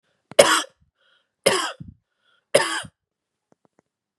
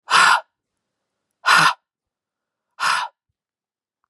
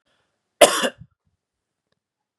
{"three_cough_length": "4.2 s", "three_cough_amplitude": 32768, "three_cough_signal_mean_std_ratio": 0.28, "exhalation_length": "4.1 s", "exhalation_amplitude": 30245, "exhalation_signal_mean_std_ratio": 0.35, "cough_length": "2.4 s", "cough_amplitude": 32768, "cough_signal_mean_std_ratio": 0.21, "survey_phase": "beta (2021-08-13 to 2022-03-07)", "age": "18-44", "gender": "Female", "wearing_mask": "No", "symptom_fatigue": true, "symptom_headache": true, "symptom_onset": "3 days", "smoker_status": "Never smoked", "respiratory_condition_asthma": false, "respiratory_condition_other": false, "recruitment_source": "Test and Trace", "submission_delay": "2 days", "covid_test_result": "Positive", "covid_test_method": "RT-qPCR", "covid_ct_value": 24.3, "covid_ct_gene": "ORF1ab gene", "covid_ct_mean": 25.0, "covid_viral_load": "6500 copies/ml", "covid_viral_load_category": "Minimal viral load (< 10K copies/ml)"}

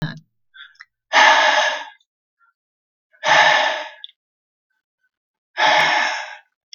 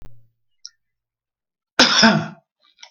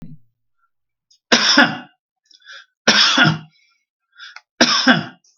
{"exhalation_length": "6.7 s", "exhalation_amplitude": 32766, "exhalation_signal_mean_std_ratio": 0.45, "cough_length": "2.9 s", "cough_amplitude": 32768, "cough_signal_mean_std_ratio": 0.32, "three_cough_length": "5.4 s", "three_cough_amplitude": 32768, "three_cough_signal_mean_std_ratio": 0.41, "survey_phase": "beta (2021-08-13 to 2022-03-07)", "age": "65+", "gender": "Male", "wearing_mask": "No", "symptom_none": true, "smoker_status": "Ex-smoker", "respiratory_condition_asthma": false, "respiratory_condition_other": false, "recruitment_source": "REACT", "submission_delay": "2 days", "covid_test_result": "Negative", "covid_test_method": "RT-qPCR", "influenza_a_test_result": "Negative", "influenza_b_test_result": "Negative"}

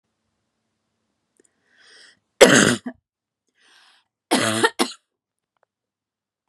{"three_cough_length": "6.5 s", "three_cough_amplitude": 32768, "three_cough_signal_mean_std_ratio": 0.25, "survey_phase": "beta (2021-08-13 to 2022-03-07)", "age": "18-44", "gender": "Female", "wearing_mask": "No", "symptom_none": true, "smoker_status": "Never smoked", "respiratory_condition_asthma": false, "respiratory_condition_other": false, "recruitment_source": "REACT", "submission_delay": "5 days", "covid_test_result": "Negative", "covid_test_method": "RT-qPCR"}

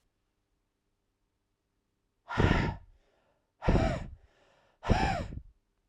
{"exhalation_length": "5.9 s", "exhalation_amplitude": 9932, "exhalation_signal_mean_std_ratio": 0.36, "survey_phase": "beta (2021-08-13 to 2022-03-07)", "age": "18-44", "gender": "Male", "wearing_mask": "No", "symptom_cough_any": true, "symptom_runny_or_blocked_nose": true, "symptom_change_to_sense_of_smell_or_taste": true, "symptom_onset": "9 days", "smoker_status": "Never smoked", "respiratory_condition_asthma": false, "respiratory_condition_other": false, "recruitment_source": "Test and Trace", "submission_delay": "6 days", "covid_test_result": "Positive", "covid_test_method": "RT-qPCR"}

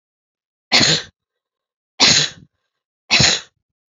{"three_cough_length": "3.9 s", "three_cough_amplitude": 32768, "three_cough_signal_mean_std_ratio": 0.38, "survey_phase": "beta (2021-08-13 to 2022-03-07)", "age": "45-64", "gender": "Female", "wearing_mask": "No", "symptom_none": true, "smoker_status": "Never smoked", "respiratory_condition_asthma": false, "respiratory_condition_other": false, "recruitment_source": "REACT", "submission_delay": "10 days", "covid_test_result": "Negative", "covid_test_method": "RT-qPCR"}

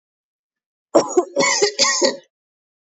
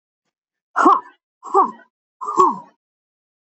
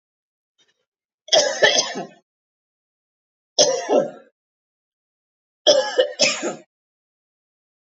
{"cough_length": "3.0 s", "cough_amplitude": 29894, "cough_signal_mean_std_ratio": 0.45, "exhalation_length": "3.5 s", "exhalation_amplitude": 26618, "exhalation_signal_mean_std_ratio": 0.35, "three_cough_length": "7.9 s", "three_cough_amplitude": 27891, "three_cough_signal_mean_std_ratio": 0.35, "survey_phase": "beta (2021-08-13 to 2022-03-07)", "age": "45-64", "gender": "Female", "wearing_mask": "No", "symptom_none": true, "smoker_status": "Never smoked", "respiratory_condition_asthma": false, "respiratory_condition_other": false, "recruitment_source": "REACT", "submission_delay": "1 day", "covid_test_result": "Negative", "covid_test_method": "RT-qPCR", "influenza_a_test_result": "Unknown/Void", "influenza_b_test_result": "Unknown/Void"}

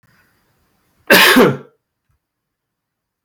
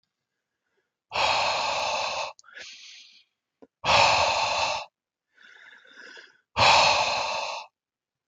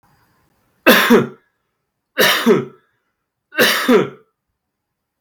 {"cough_length": "3.2 s", "cough_amplitude": 32768, "cough_signal_mean_std_ratio": 0.32, "exhalation_length": "8.3 s", "exhalation_amplitude": 16616, "exhalation_signal_mean_std_ratio": 0.51, "three_cough_length": "5.2 s", "three_cough_amplitude": 32768, "three_cough_signal_mean_std_ratio": 0.41, "survey_phase": "beta (2021-08-13 to 2022-03-07)", "age": "18-44", "gender": "Male", "wearing_mask": "No", "symptom_none": true, "smoker_status": "Never smoked", "respiratory_condition_asthma": false, "respiratory_condition_other": false, "recruitment_source": "REACT", "submission_delay": "6 days", "covid_test_result": "Negative", "covid_test_method": "RT-qPCR", "influenza_a_test_result": "Negative", "influenza_b_test_result": "Negative"}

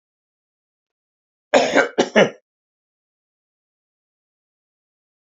{"cough_length": "5.2 s", "cough_amplitude": 30409, "cough_signal_mean_std_ratio": 0.24, "survey_phase": "beta (2021-08-13 to 2022-03-07)", "age": "65+", "gender": "Male", "wearing_mask": "No", "symptom_cough_any": true, "symptom_runny_or_blocked_nose": true, "symptom_headache": true, "smoker_status": "Ex-smoker", "respiratory_condition_asthma": false, "respiratory_condition_other": false, "recruitment_source": "Test and Trace", "submission_delay": "1 day", "covid_test_result": "Positive", "covid_test_method": "RT-qPCR", "covid_ct_value": 26.9, "covid_ct_gene": "ORF1ab gene"}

